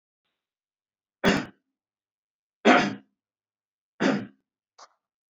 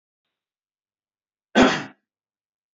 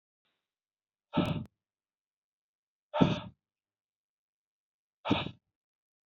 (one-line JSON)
{"three_cough_length": "5.3 s", "three_cough_amplitude": 19595, "three_cough_signal_mean_std_ratio": 0.27, "cough_length": "2.7 s", "cough_amplitude": 25153, "cough_signal_mean_std_ratio": 0.23, "exhalation_length": "6.1 s", "exhalation_amplitude": 10517, "exhalation_signal_mean_std_ratio": 0.25, "survey_phase": "beta (2021-08-13 to 2022-03-07)", "age": "18-44", "gender": "Male", "wearing_mask": "No", "symptom_none": true, "smoker_status": "Never smoked", "respiratory_condition_asthma": false, "respiratory_condition_other": false, "recruitment_source": "Test and Trace", "submission_delay": "3 days", "covid_test_result": "Negative", "covid_test_method": "RT-qPCR"}